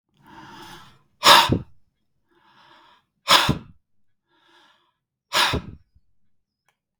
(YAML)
exhalation_length: 7.0 s
exhalation_amplitude: 32768
exhalation_signal_mean_std_ratio: 0.27
survey_phase: beta (2021-08-13 to 2022-03-07)
age: 45-64
gender: Male
wearing_mask: 'No'
symptom_none: true
smoker_status: Never smoked
respiratory_condition_asthma: false
respiratory_condition_other: false
recruitment_source: REACT
submission_delay: 4 days
covid_test_result: Negative
covid_test_method: RT-qPCR
influenza_a_test_result: Negative
influenza_b_test_result: Negative